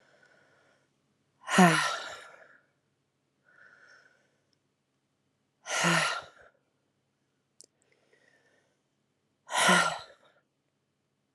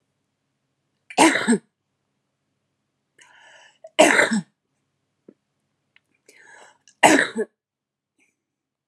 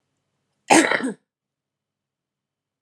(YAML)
exhalation_length: 11.3 s
exhalation_amplitude: 19098
exhalation_signal_mean_std_ratio: 0.27
three_cough_length: 8.9 s
three_cough_amplitude: 32688
three_cough_signal_mean_std_ratio: 0.27
cough_length: 2.8 s
cough_amplitude: 30073
cough_signal_mean_std_ratio: 0.26
survey_phase: alpha (2021-03-01 to 2021-08-12)
age: 18-44
gender: Female
wearing_mask: 'No'
symptom_cough_any: true
smoker_status: Current smoker (11 or more cigarettes per day)
respiratory_condition_asthma: true
respiratory_condition_other: false
recruitment_source: Test and Trace
submission_delay: 2 days
covid_test_result: Positive
covid_test_method: RT-qPCR
covid_ct_value: 18.2
covid_ct_gene: ORF1ab gene
covid_ct_mean: 18.2
covid_viral_load: 1100000 copies/ml
covid_viral_load_category: High viral load (>1M copies/ml)